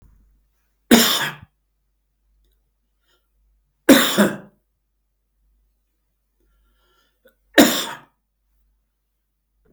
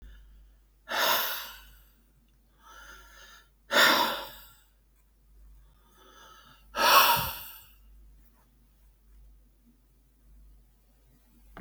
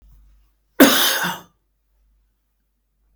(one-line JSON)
{"three_cough_length": "9.7 s", "three_cough_amplitude": 32768, "three_cough_signal_mean_std_ratio": 0.24, "exhalation_length": "11.6 s", "exhalation_amplitude": 17290, "exhalation_signal_mean_std_ratio": 0.32, "cough_length": "3.2 s", "cough_amplitude": 32768, "cough_signal_mean_std_ratio": 0.3, "survey_phase": "beta (2021-08-13 to 2022-03-07)", "age": "65+", "gender": "Male", "wearing_mask": "No", "symptom_none": true, "smoker_status": "Ex-smoker", "respiratory_condition_asthma": false, "respiratory_condition_other": false, "recruitment_source": "REACT", "submission_delay": "3 days", "covid_test_result": "Negative", "covid_test_method": "RT-qPCR", "influenza_a_test_result": "Negative", "influenza_b_test_result": "Negative"}